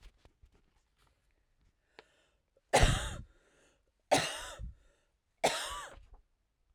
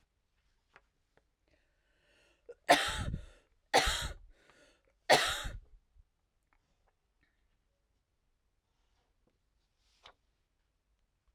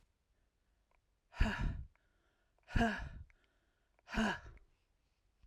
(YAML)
three_cough_length: 6.7 s
three_cough_amplitude: 8423
three_cough_signal_mean_std_ratio: 0.29
cough_length: 11.3 s
cough_amplitude: 12524
cough_signal_mean_std_ratio: 0.23
exhalation_length: 5.5 s
exhalation_amplitude: 3821
exhalation_signal_mean_std_ratio: 0.35
survey_phase: alpha (2021-03-01 to 2021-08-12)
age: 45-64
gender: Female
wearing_mask: 'No'
symptom_cough_any: true
symptom_shortness_of_breath: true
symptom_fatigue: true
symptom_onset: 3 days
smoker_status: Never smoked
respiratory_condition_asthma: false
respiratory_condition_other: false
recruitment_source: Test and Trace
submission_delay: 2 days
covid_test_result: Positive
covid_test_method: RT-qPCR
covid_ct_value: 17.3
covid_ct_gene: ORF1ab gene
covid_ct_mean: 17.7
covid_viral_load: 1500000 copies/ml
covid_viral_load_category: High viral load (>1M copies/ml)